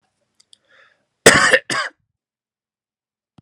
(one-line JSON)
{"cough_length": "3.4 s", "cough_amplitude": 32768, "cough_signal_mean_std_ratio": 0.26, "survey_phase": "alpha (2021-03-01 to 2021-08-12)", "age": "18-44", "gender": "Male", "wearing_mask": "No", "symptom_none": true, "smoker_status": "Never smoked", "respiratory_condition_asthma": false, "respiratory_condition_other": false, "recruitment_source": "REACT", "submission_delay": "1 day", "covid_test_result": "Negative", "covid_test_method": "RT-qPCR"}